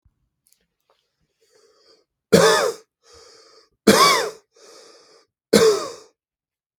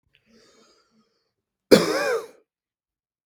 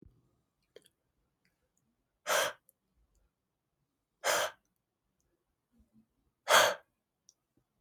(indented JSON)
{
  "three_cough_length": "6.8 s",
  "three_cough_amplitude": 32768,
  "three_cough_signal_mean_std_ratio": 0.32,
  "cough_length": "3.3 s",
  "cough_amplitude": 32768,
  "cough_signal_mean_std_ratio": 0.25,
  "exhalation_length": "7.8 s",
  "exhalation_amplitude": 10877,
  "exhalation_signal_mean_std_ratio": 0.23,
  "survey_phase": "beta (2021-08-13 to 2022-03-07)",
  "age": "18-44",
  "gender": "Male",
  "wearing_mask": "No",
  "symptom_fatigue": true,
  "smoker_status": "Ex-smoker",
  "respiratory_condition_asthma": false,
  "respiratory_condition_other": false,
  "recruitment_source": "Test and Trace",
  "submission_delay": "2 days",
  "covid_test_result": "Positive",
  "covid_test_method": "RT-qPCR",
  "covid_ct_value": 28.5,
  "covid_ct_gene": "N gene"
}